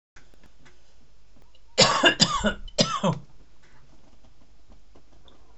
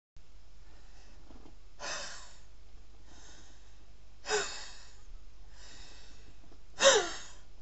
{
  "cough_length": "5.6 s",
  "cough_amplitude": 28968,
  "cough_signal_mean_std_ratio": 0.48,
  "exhalation_length": "7.6 s",
  "exhalation_amplitude": 11545,
  "exhalation_signal_mean_std_ratio": 0.79,
  "survey_phase": "beta (2021-08-13 to 2022-03-07)",
  "age": "18-44",
  "gender": "Male",
  "wearing_mask": "No",
  "symptom_cough_any": true,
  "symptom_runny_or_blocked_nose": true,
  "symptom_fatigue": true,
  "smoker_status": "Current smoker (1 to 10 cigarettes per day)",
  "respiratory_condition_asthma": false,
  "respiratory_condition_other": false,
  "recruitment_source": "REACT",
  "submission_delay": "1 day",
  "covid_test_result": "Negative",
  "covid_test_method": "RT-qPCR"
}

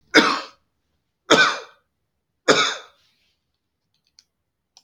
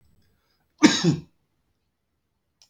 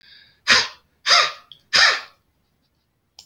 {
  "three_cough_length": "4.8 s",
  "three_cough_amplitude": 32767,
  "three_cough_signal_mean_std_ratio": 0.3,
  "cough_length": "2.7 s",
  "cough_amplitude": 29263,
  "cough_signal_mean_std_ratio": 0.25,
  "exhalation_length": "3.3 s",
  "exhalation_amplitude": 29669,
  "exhalation_signal_mean_std_ratio": 0.37,
  "survey_phase": "beta (2021-08-13 to 2022-03-07)",
  "age": "45-64",
  "gender": "Male",
  "wearing_mask": "No",
  "symptom_runny_or_blocked_nose": true,
  "symptom_onset": "3 days",
  "smoker_status": "Never smoked",
  "respiratory_condition_asthma": false,
  "respiratory_condition_other": false,
  "recruitment_source": "REACT",
  "submission_delay": "1 day",
  "covid_test_result": "Negative",
  "covid_test_method": "RT-qPCR"
}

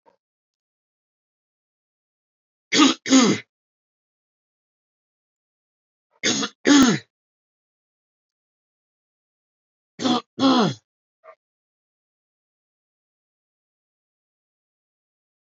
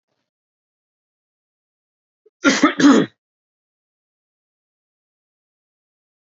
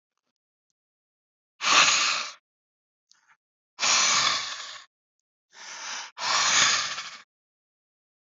{
  "three_cough_length": "15.4 s",
  "three_cough_amplitude": 23867,
  "three_cough_signal_mean_std_ratio": 0.25,
  "cough_length": "6.2 s",
  "cough_amplitude": 28146,
  "cough_signal_mean_std_ratio": 0.22,
  "exhalation_length": "8.3 s",
  "exhalation_amplitude": 20114,
  "exhalation_signal_mean_std_ratio": 0.44,
  "survey_phase": "beta (2021-08-13 to 2022-03-07)",
  "age": "18-44",
  "gender": "Male",
  "wearing_mask": "No",
  "symptom_none": true,
  "smoker_status": "Never smoked",
  "respiratory_condition_asthma": false,
  "respiratory_condition_other": false,
  "recruitment_source": "REACT",
  "submission_delay": "2 days",
  "covid_test_result": "Negative",
  "covid_test_method": "RT-qPCR"
}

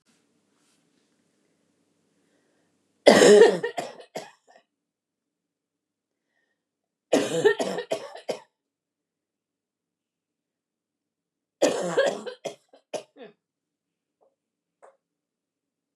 {
  "three_cough_length": "16.0 s",
  "three_cough_amplitude": 29204,
  "three_cough_signal_mean_std_ratio": 0.24,
  "survey_phase": "beta (2021-08-13 to 2022-03-07)",
  "age": "45-64",
  "gender": "Female",
  "wearing_mask": "No",
  "symptom_cough_any": true,
  "smoker_status": "Never smoked",
  "respiratory_condition_asthma": false,
  "respiratory_condition_other": false,
  "recruitment_source": "REACT",
  "submission_delay": "1 day",
  "covid_test_result": "Negative",
  "covid_test_method": "RT-qPCR",
  "influenza_a_test_result": "Negative",
  "influenza_b_test_result": "Negative"
}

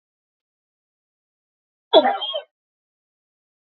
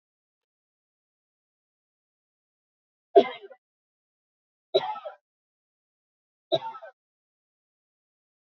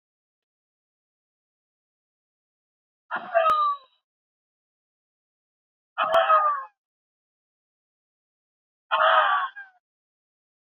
{
  "cough_length": "3.7 s",
  "cough_amplitude": 27901,
  "cough_signal_mean_std_ratio": 0.22,
  "three_cough_length": "8.4 s",
  "three_cough_amplitude": 20301,
  "three_cough_signal_mean_std_ratio": 0.15,
  "exhalation_length": "10.8 s",
  "exhalation_amplitude": 14762,
  "exhalation_signal_mean_std_ratio": 0.33,
  "survey_phase": "beta (2021-08-13 to 2022-03-07)",
  "age": "45-64",
  "gender": "Female",
  "wearing_mask": "No",
  "symptom_none": true,
  "smoker_status": "Never smoked",
  "respiratory_condition_asthma": false,
  "respiratory_condition_other": false,
  "recruitment_source": "REACT",
  "submission_delay": "3 days",
  "covid_test_result": "Negative",
  "covid_test_method": "RT-qPCR",
  "influenza_a_test_result": "Unknown/Void",
  "influenza_b_test_result": "Unknown/Void"
}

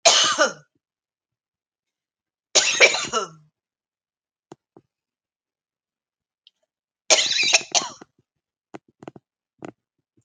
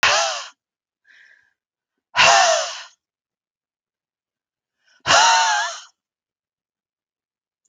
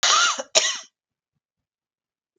{
  "three_cough_length": "10.2 s",
  "three_cough_amplitude": 32768,
  "three_cough_signal_mean_std_ratio": 0.29,
  "exhalation_length": "7.7 s",
  "exhalation_amplitude": 31199,
  "exhalation_signal_mean_std_ratio": 0.36,
  "cough_length": "2.4 s",
  "cough_amplitude": 32767,
  "cough_signal_mean_std_ratio": 0.39,
  "survey_phase": "beta (2021-08-13 to 2022-03-07)",
  "age": "45-64",
  "gender": "Female",
  "wearing_mask": "No",
  "symptom_none": true,
  "smoker_status": "Never smoked",
  "respiratory_condition_asthma": false,
  "respiratory_condition_other": false,
  "recruitment_source": "REACT",
  "submission_delay": "2 days",
  "covid_test_result": "Negative",
  "covid_test_method": "RT-qPCR"
}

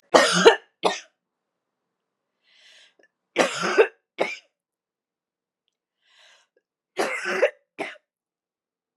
{
  "three_cough_length": "9.0 s",
  "three_cough_amplitude": 32755,
  "three_cough_signal_mean_std_ratio": 0.29,
  "survey_phase": "beta (2021-08-13 to 2022-03-07)",
  "age": "18-44",
  "gender": "Female",
  "wearing_mask": "No",
  "symptom_none": true,
  "smoker_status": "Never smoked",
  "respiratory_condition_asthma": false,
  "respiratory_condition_other": false,
  "recruitment_source": "REACT",
  "submission_delay": "2 days",
  "covid_test_result": "Negative",
  "covid_test_method": "RT-qPCR"
}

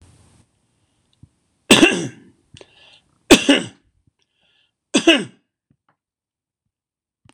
{
  "three_cough_length": "7.3 s",
  "three_cough_amplitude": 26028,
  "three_cough_signal_mean_std_ratio": 0.25,
  "survey_phase": "beta (2021-08-13 to 2022-03-07)",
  "age": "45-64",
  "gender": "Male",
  "wearing_mask": "No",
  "symptom_none": true,
  "smoker_status": "Never smoked",
  "respiratory_condition_asthma": false,
  "respiratory_condition_other": false,
  "recruitment_source": "REACT",
  "submission_delay": "1 day",
  "covid_test_result": "Negative",
  "covid_test_method": "RT-qPCR"
}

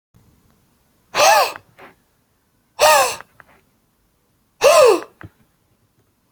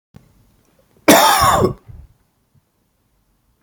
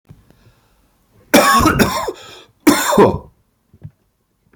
{
  "exhalation_length": "6.3 s",
  "exhalation_amplitude": 30716,
  "exhalation_signal_mean_std_ratio": 0.34,
  "cough_length": "3.6 s",
  "cough_amplitude": 32767,
  "cough_signal_mean_std_ratio": 0.35,
  "three_cough_length": "4.6 s",
  "three_cough_amplitude": 32768,
  "three_cough_signal_mean_std_ratio": 0.43,
  "survey_phase": "beta (2021-08-13 to 2022-03-07)",
  "age": "18-44",
  "gender": "Male",
  "wearing_mask": "No",
  "symptom_cough_any": true,
  "symptom_runny_or_blocked_nose": true,
  "symptom_sore_throat": true,
  "symptom_fatigue": true,
  "symptom_onset": "4 days",
  "smoker_status": "Ex-smoker",
  "respiratory_condition_asthma": true,
  "respiratory_condition_other": false,
  "recruitment_source": "REACT",
  "submission_delay": "1 day",
  "covid_test_result": "Negative",
  "covid_test_method": "RT-qPCR"
}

